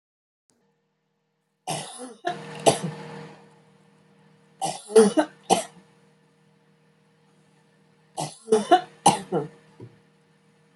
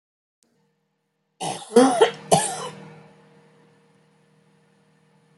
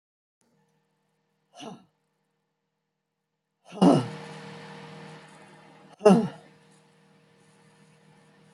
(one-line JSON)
{"three_cough_length": "10.8 s", "three_cough_amplitude": 25508, "three_cough_signal_mean_std_ratio": 0.29, "cough_length": "5.4 s", "cough_amplitude": 26098, "cough_signal_mean_std_ratio": 0.29, "exhalation_length": "8.5 s", "exhalation_amplitude": 18933, "exhalation_signal_mean_std_ratio": 0.23, "survey_phase": "beta (2021-08-13 to 2022-03-07)", "age": "65+", "gender": "Female", "wearing_mask": "No", "symptom_none": true, "smoker_status": "Ex-smoker", "respiratory_condition_asthma": false, "respiratory_condition_other": false, "recruitment_source": "REACT", "submission_delay": "2 days", "covid_test_result": "Negative", "covid_test_method": "RT-qPCR", "influenza_a_test_result": "Unknown/Void", "influenza_b_test_result": "Unknown/Void"}